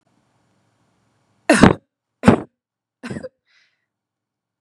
{"three_cough_length": "4.6 s", "three_cough_amplitude": 32768, "three_cough_signal_mean_std_ratio": 0.22, "survey_phase": "beta (2021-08-13 to 2022-03-07)", "age": "18-44", "gender": "Female", "wearing_mask": "No", "symptom_none": true, "smoker_status": "Never smoked", "respiratory_condition_asthma": false, "respiratory_condition_other": false, "recruitment_source": "REACT", "submission_delay": "1 day", "covid_test_result": "Negative", "covid_test_method": "RT-qPCR"}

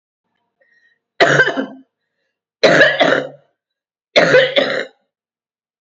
{"three_cough_length": "5.8 s", "three_cough_amplitude": 32096, "three_cough_signal_mean_std_ratio": 0.43, "survey_phase": "beta (2021-08-13 to 2022-03-07)", "age": "65+", "gender": "Female", "wearing_mask": "No", "symptom_cough_any": true, "symptom_runny_or_blocked_nose": true, "symptom_headache": true, "symptom_onset": "6 days", "smoker_status": "Ex-smoker", "respiratory_condition_asthma": false, "respiratory_condition_other": false, "recruitment_source": "Test and Trace", "submission_delay": "1 day", "covid_test_result": "Positive", "covid_test_method": "RT-qPCR", "covid_ct_value": 20.7, "covid_ct_gene": "N gene", "covid_ct_mean": 21.9, "covid_viral_load": "65000 copies/ml", "covid_viral_load_category": "Low viral load (10K-1M copies/ml)"}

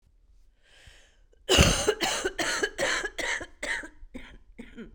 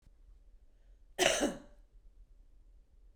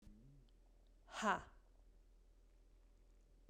{"three_cough_length": "4.9 s", "three_cough_amplitude": 20731, "three_cough_signal_mean_std_ratio": 0.49, "cough_length": "3.2 s", "cough_amplitude": 7643, "cough_signal_mean_std_ratio": 0.33, "exhalation_length": "3.5 s", "exhalation_amplitude": 1826, "exhalation_signal_mean_std_ratio": 0.32, "survey_phase": "beta (2021-08-13 to 2022-03-07)", "age": "45-64", "gender": "Female", "wearing_mask": "No", "symptom_cough_any": true, "symptom_runny_or_blocked_nose": true, "symptom_headache": true, "symptom_change_to_sense_of_smell_or_taste": true, "symptom_loss_of_taste": true, "symptom_other": true, "smoker_status": "Never smoked", "respiratory_condition_asthma": false, "respiratory_condition_other": false, "recruitment_source": "Test and Trace", "submission_delay": "3 days", "covid_test_result": "Positive", "covid_test_method": "RT-qPCR", "covid_ct_value": 15.4, "covid_ct_gene": "ORF1ab gene", "covid_ct_mean": 15.6, "covid_viral_load": "7400000 copies/ml", "covid_viral_load_category": "High viral load (>1M copies/ml)"}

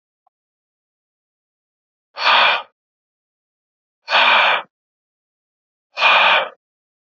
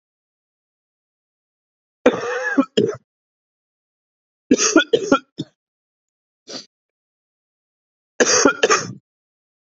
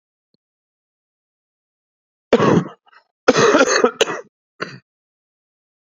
{"exhalation_length": "7.2 s", "exhalation_amplitude": 28091, "exhalation_signal_mean_std_ratio": 0.36, "three_cough_length": "9.7 s", "three_cough_amplitude": 32736, "three_cough_signal_mean_std_ratio": 0.31, "cough_length": "5.8 s", "cough_amplitude": 32768, "cough_signal_mean_std_ratio": 0.34, "survey_phase": "alpha (2021-03-01 to 2021-08-12)", "age": "18-44", "gender": "Male", "wearing_mask": "No", "symptom_cough_any": true, "symptom_abdominal_pain": true, "symptom_diarrhoea": true, "symptom_fatigue": true, "symptom_headache": true, "smoker_status": "Prefer not to say", "respiratory_condition_asthma": false, "respiratory_condition_other": false, "recruitment_source": "Test and Trace", "submission_delay": "1 day", "covid_test_result": "Positive", "covid_test_method": "LFT"}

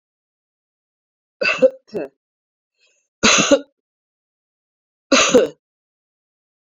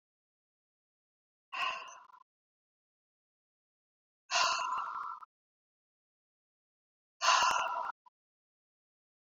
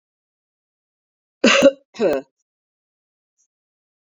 {"three_cough_length": "6.7 s", "three_cough_amplitude": 32767, "three_cough_signal_mean_std_ratio": 0.3, "exhalation_length": "9.2 s", "exhalation_amplitude": 6421, "exhalation_signal_mean_std_ratio": 0.33, "cough_length": "4.1 s", "cough_amplitude": 27974, "cough_signal_mean_std_ratio": 0.26, "survey_phase": "beta (2021-08-13 to 2022-03-07)", "age": "45-64", "gender": "Female", "wearing_mask": "No", "symptom_runny_or_blocked_nose": true, "symptom_onset": "2 days", "smoker_status": "Ex-smoker", "respiratory_condition_asthma": false, "respiratory_condition_other": false, "recruitment_source": "Test and Trace", "submission_delay": "1 day", "covid_test_result": "Positive", "covid_test_method": "ePCR"}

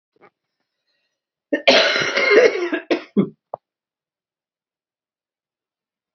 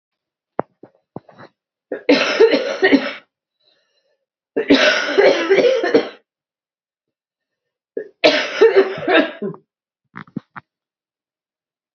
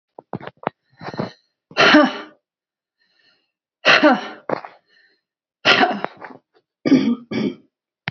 {"cough_length": "6.1 s", "cough_amplitude": 32364, "cough_signal_mean_std_ratio": 0.35, "three_cough_length": "11.9 s", "three_cough_amplitude": 32602, "three_cough_signal_mean_std_ratio": 0.42, "exhalation_length": "8.1 s", "exhalation_amplitude": 29638, "exhalation_signal_mean_std_ratio": 0.36, "survey_phase": "beta (2021-08-13 to 2022-03-07)", "age": "45-64", "gender": "Female", "wearing_mask": "No", "symptom_cough_any": true, "symptom_runny_or_blocked_nose": true, "symptom_onset": "8 days", "smoker_status": "Ex-smoker", "respiratory_condition_asthma": false, "respiratory_condition_other": false, "recruitment_source": "Test and Trace", "submission_delay": "1 day", "covid_test_result": "Positive", "covid_test_method": "RT-qPCR", "covid_ct_value": 21.6, "covid_ct_gene": "ORF1ab gene", "covid_ct_mean": 22.2, "covid_viral_load": "52000 copies/ml", "covid_viral_load_category": "Low viral load (10K-1M copies/ml)"}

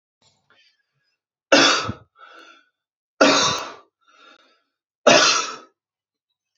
{"three_cough_length": "6.6 s", "three_cough_amplitude": 32767, "three_cough_signal_mean_std_ratio": 0.33, "survey_phase": "beta (2021-08-13 to 2022-03-07)", "age": "18-44", "gender": "Male", "wearing_mask": "No", "symptom_none": true, "smoker_status": "Never smoked", "respiratory_condition_asthma": false, "respiratory_condition_other": false, "recruitment_source": "REACT", "submission_delay": "1 day", "covid_test_result": "Negative", "covid_test_method": "RT-qPCR", "influenza_a_test_result": "Negative", "influenza_b_test_result": "Negative"}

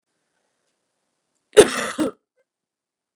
{"cough_length": "3.2 s", "cough_amplitude": 32768, "cough_signal_mean_std_ratio": 0.2, "survey_phase": "beta (2021-08-13 to 2022-03-07)", "age": "18-44", "gender": "Female", "wearing_mask": "No", "symptom_cough_any": true, "symptom_runny_or_blocked_nose": true, "symptom_sore_throat": true, "symptom_onset": "3 days", "smoker_status": "Never smoked", "respiratory_condition_asthma": false, "respiratory_condition_other": false, "recruitment_source": "Test and Trace", "submission_delay": "2 days", "covid_test_result": "Positive", "covid_test_method": "RT-qPCR", "covid_ct_value": 24.6, "covid_ct_gene": "N gene"}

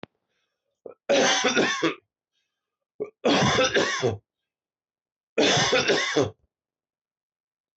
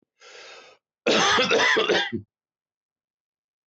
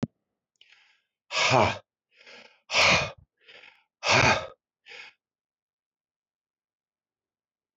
{"three_cough_length": "7.8 s", "three_cough_amplitude": 13005, "three_cough_signal_mean_std_ratio": 0.49, "cough_length": "3.7 s", "cough_amplitude": 12894, "cough_signal_mean_std_ratio": 0.48, "exhalation_length": "7.8 s", "exhalation_amplitude": 15212, "exhalation_signal_mean_std_ratio": 0.31, "survey_phase": "beta (2021-08-13 to 2022-03-07)", "age": "45-64", "gender": "Male", "wearing_mask": "No", "symptom_none": true, "smoker_status": "Never smoked", "respiratory_condition_asthma": false, "respiratory_condition_other": false, "recruitment_source": "REACT", "submission_delay": "3 days", "covid_test_result": "Negative", "covid_test_method": "RT-qPCR", "influenza_a_test_result": "Unknown/Void", "influenza_b_test_result": "Unknown/Void"}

